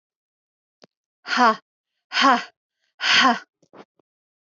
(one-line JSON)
{"exhalation_length": "4.4 s", "exhalation_amplitude": 21499, "exhalation_signal_mean_std_ratio": 0.35, "survey_phase": "alpha (2021-03-01 to 2021-08-12)", "age": "18-44", "gender": "Female", "wearing_mask": "No", "symptom_none": true, "smoker_status": "Never smoked", "respiratory_condition_asthma": false, "respiratory_condition_other": false, "recruitment_source": "REACT", "submission_delay": "1 day", "covid_test_result": "Negative", "covid_test_method": "RT-qPCR"}